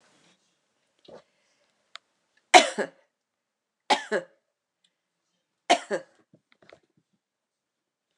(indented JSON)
{
  "three_cough_length": "8.2 s",
  "three_cough_amplitude": 29204,
  "three_cough_signal_mean_std_ratio": 0.17,
  "survey_phase": "alpha (2021-03-01 to 2021-08-12)",
  "age": "65+",
  "gender": "Female",
  "wearing_mask": "No",
  "symptom_none": true,
  "smoker_status": "Never smoked",
  "respiratory_condition_asthma": false,
  "respiratory_condition_other": false,
  "recruitment_source": "REACT",
  "submission_delay": "2 days",
  "covid_test_result": "Negative",
  "covid_test_method": "RT-qPCR"
}